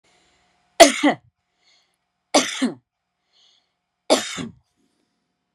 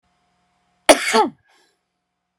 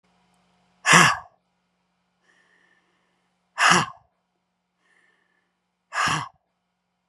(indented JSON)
{
  "three_cough_length": "5.5 s",
  "three_cough_amplitude": 32768,
  "three_cough_signal_mean_std_ratio": 0.25,
  "cough_length": "2.4 s",
  "cough_amplitude": 32768,
  "cough_signal_mean_std_ratio": 0.26,
  "exhalation_length": "7.1 s",
  "exhalation_amplitude": 31914,
  "exhalation_signal_mean_std_ratio": 0.26,
  "survey_phase": "beta (2021-08-13 to 2022-03-07)",
  "age": "45-64",
  "gender": "Female",
  "wearing_mask": "No",
  "symptom_none": true,
  "smoker_status": "Never smoked",
  "respiratory_condition_asthma": false,
  "respiratory_condition_other": false,
  "recruitment_source": "REACT",
  "submission_delay": "3 days",
  "covid_test_result": "Negative",
  "covid_test_method": "RT-qPCR"
}